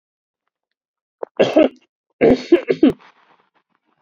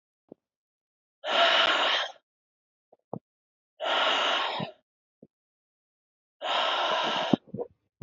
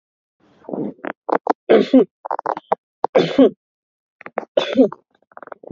{"cough_length": "4.0 s", "cough_amplitude": 28282, "cough_signal_mean_std_ratio": 0.32, "exhalation_length": "8.0 s", "exhalation_amplitude": 16520, "exhalation_signal_mean_std_ratio": 0.48, "three_cough_length": "5.7 s", "three_cough_amplitude": 27632, "three_cough_signal_mean_std_ratio": 0.35, "survey_phase": "alpha (2021-03-01 to 2021-08-12)", "age": "18-44", "gender": "Male", "wearing_mask": "No", "symptom_diarrhoea": true, "symptom_fever_high_temperature": true, "symptom_headache": true, "smoker_status": "Never smoked", "respiratory_condition_asthma": false, "respiratory_condition_other": false, "recruitment_source": "Test and Trace", "submission_delay": "1 day", "covid_test_result": "Positive", "covid_test_method": "RT-qPCR", "covid_ct_value": 14.1, "covid_ct_gene": "ORF1ab gene", "covid_ct_mean": 14.3, "covid_viral_load": "21000000 copies/ml", "covid_viral_load_category": "High viral load (>1M copies/ml)"}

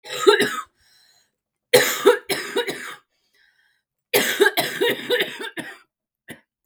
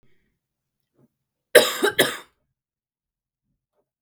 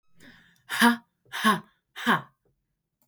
{"three_cough_length": "6.7 s", "three_cough_amplitude": 32768, "three_cough_signal_mean_std_ratio": 0.43, "cough_length": "4.0 s", "cough_amplitude": 32768, "cough_signal_mean_std_ratio": 0.22, "exhalation_length": "3.1 s", "exhalation_amplitude": 16640, "exhalation_signal_mean_std_ratio": 0.35, "survey_phase": "beta (2021-08-13 to 2022-03-07)", "age": "18-44", "gender": "Female", "wearing_mask": "No", "symptom_cough_any": true, "symptom_new_continuous_cough": true, "symptom_runny_or_blocked_nose": true, "symptom_shortness_of_breath": true, "symptom_headache": true, "symptom_onset": "4 days", "smoker_status": "Never smoked", "respiratory_condition_asthma": false, "respiratory_condition_other": false, "recruitment_source": "Test and Trace", "submission_delay": "1 day", "covid_test_result": "Negative", "covid_test_method": "RT-qPCR"}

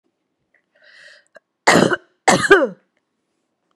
{"cough_length": "3.8 s", "cough_amplitude": 32768, "cough_signal_mean_std_ratio": 0.31, "survey_phase": "beta (2021-08-13 to 2022-03-07)", "age": "45-64", "gender": "Female", "wearing_mask": "No", "symptom_none": true, "smoker_status": "Ex-smoker", "respiratory_condition_asthma": false, "respiratory_condition_other": false, "recruitment_source": "REACT", "submission_delay": "0 days", "covid_test_result": "Negative", "covid_test_method": "RT-qPCR", "influenza_a_test_result": "Negative", "influenza_b_test_result": "Negative"}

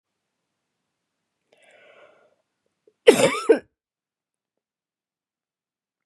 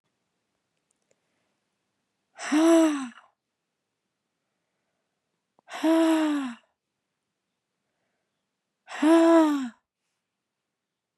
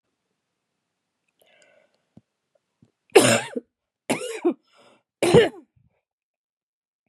{"cough_length": "6.1 s", "cough_amplitude": 32409, "cough_signal_mean_std_ratio": 0.18, "exhalation_length": "11.2 s", "exhalation_amplitude": 12041, "exhalation_signal_mean_std_ratio": 0.34, "three_cough_length": "7.1 s", "three_cough_amplitude": 32672, "three_cough_signal_mean_std_ratio": 0.25, "survey_phase": "beta (2021-08-13 to 2022-03-07)", "age": "18-44", "gender": "Female", "wearing_mask": "No", "symptom_cough_any": true, "symptom_new_continuous_cough": true, "symptom_runny_or_blocked_nose": true, "symptom_shortness_of_breath": true, "symptom_fatigue": true, "smoker_status": "Never smoked", "respiratory_condition_asthma": false, "respiratory_condition_other": false, "recruitment_source": "Test and Trace", "submission_delay": "5 days", "covid_test_result": "Positive", "covid_test_method": "RT-qPCR", "covid_ct_value": 19.5, "covid_ct_gene": "ORF1ab gene", "covid_ct_mean": 20.0, "covid_viral_load": "280000 copies/ml", "covid_viral_load_category": "Low viral load (10K-1M copies/ml)"}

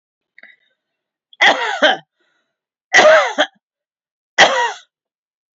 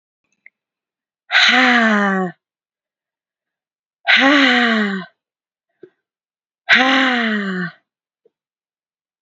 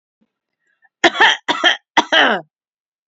{"three_cough_length": "5.5 s", "three_cough_amplitude": 30761, "three_cough_signal_mean_std_ratio": 0.37, "exhalation_length": "9.2 s", "exhalation_amplitude": 32768, "exhalation_signal_mean_std_ratio": 0.46, "cough_length": "3.1 s", "cough_amplitude": 30877, "cough_signal_mean_std_ratio": 0.4, "survey_phase": "beta (2021-08-13 to 2022-03-07)", "age": "18-44", "gender": "Female", "wearing_mask": "No", "symptom_none": true, "symptom_onset": "12 days", "smoker_status": "Never smoked", "respiratory_condition_asthma": false, "respiratory_condition_other": false, "recruitment_source": "REACT", "submission_delay": "3 days", "covid_test_result": "Positive", "covid_test_method": "RT-qPCR", "covid_ct_value": 33.9, "covid_ct_gene": "E gene", "influenza_a_test_result": "Negative", "influenza_b_test_result": "Negative"}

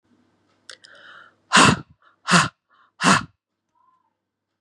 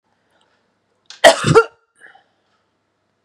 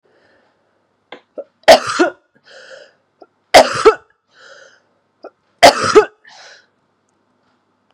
{"exhalation_length": "4.6 s", "exhalation_amplitude": 31538, "exhalation_signal_mean_std_ratio": 0.29, "cough_length": "3.2 s", "cough_amplitude": 32768, "cough_signal_mean_std_ratio": 0.24, "three_cough_length": "7.9 s", "three_cough_amplitude": 32768, "three_cough_signal_mean_std_ratio": 0.27, "survey_phase": "beta (2021-08-13 to 2022-03-07)", "age": "45-64", "gender": "Female", "wearing_mask": "No", "symptom_runny_or_blocked_nose": true, "symptom_sore_throat": true, "symptom_fatigue": true, "symptom_headache": true, "smoker_status": "Ex-smoker", "respiratory_condition_asthma": false, "respiratory_condition_other": false, "recruitment_source": "Test and Trace", "submission_delay": "2 days", "covid_test_result": "Positive", "covid_test_method": "LAMP"}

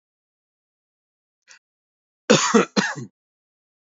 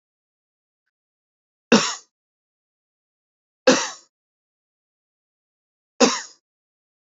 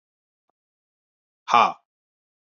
{"cough_length": "3.8 s", "cough_amplitude": 27923, "cough_signal_mean_std_ratio": 0.27, "three_cough_length": "7.1 s", "three_cough_amplitude": 32373, "three_cough_signal_mean_std_ratio": 0.2, "exhalation_length": "2.5 s", "exhalation_amplitude": 26275, "exhalation_signal_mean_std_ratio": 0.21, "survey_phase": "beta (2021-08-13 to 2022-03-07)", "age": "45-64", "gender": "Male", "wearing_mask": "No", "symptom_none": true, "smoker_status": "Ex-smoker", "respiratory_condition_asthma": false, "respiratory_condition_other": false, "recruitment_source": "REACT", "submission_delay": "3 days", "covid_test_result": "Negative", "covid_test_method": "RT-qPCR", "influenza_a_test_result": "Negative", "influenza_b_test_result": "Negative"}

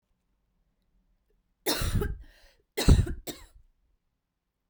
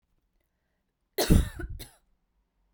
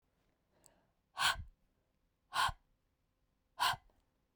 {"three_cough_length": "4.7 s", "three_cough_amplitude": 17381, "three_cough_signal_mean_std_ratio": 0.29, "cough_length": "2.7 s", "cough_amplitude": 16280, "cough_signal_mean_std_ratio": 0.26, "exhalation_length": "4.4 s", "exhalation_amplitude": 4014, "exhalation_signal_mean_std_ratio": 0.29, "survey_phase": "beta (2021-08-13 to 2022-03-07)", "age": "18-44", "gender": "Female", "wearing_mask": "No", "symptom_runny_or_blocked_nose": true, "symptom_sore_throat": true, "symptom_abdominal_pain": true, "symptom_fatigue": true, "symptom_headache": true, "symptom_onset": "2 days", "smoker_status": "Never smoked", "respiratory_condition_asthma": false, "respiratory_condition_other": false, "recruitment_source": "Test and Trace", "submission_delay": "2 days", "covid_test_result": "Positive", "covid_test_method": "LAMP"}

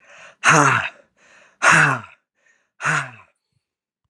{"exhalation_length": "4.1 s", "exhalation_amplitude": 32259, "exhalation_signal_mean_std_ratio": 0.39, "survey_phase": "alpha (2021-03-01 to 2021-08-12)", "age": "45-64", "gender": "Male", "wearing_mask": "No", "symptom_none": true, "symptom_onset": "8 days", "smoker_status": "Never smoked", "respiratory_condition_asthma": false, "respiratory_condition_other": false, "recruitment_source": "REACT", "submission_delay": "3 days", "covid_test_result": "Negative", "covid_test_method": "RT-qPCR"}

